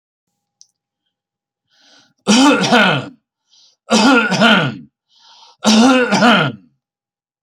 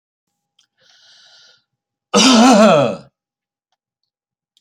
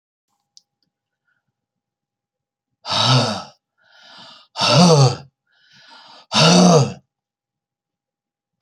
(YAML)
three_cough_length: 7.4 s
three_cough_amplitude: 32025
three_cough_signal_mean_std_ratio: 0.5
cough_length: 4.6 s
cough_amplitude: 32293
cough_signal_mean_std_ratio: 0.36
exhalation_length: 8.6 s
exhalation_amplitude: 30744
exhalation_signal_mean_std_ratio: 0.36
survey_phase: beta (2021-08-13 to 2022-03-07)
age: 65+
gender: Male
wearing_mask: 'No'
symptom_none: true
symptom_onset: 8 days
smoker_status: Ex-smoker
respiratory_condition_asthma: false
respiratory_condition_other: false
recruitment_source: REACT
submission_delay: 4 days
covid_test_result: Negative
covid_test_method: RT-qPCR
influenza_a_test_result: Negative
influenza_b_test_result: Negative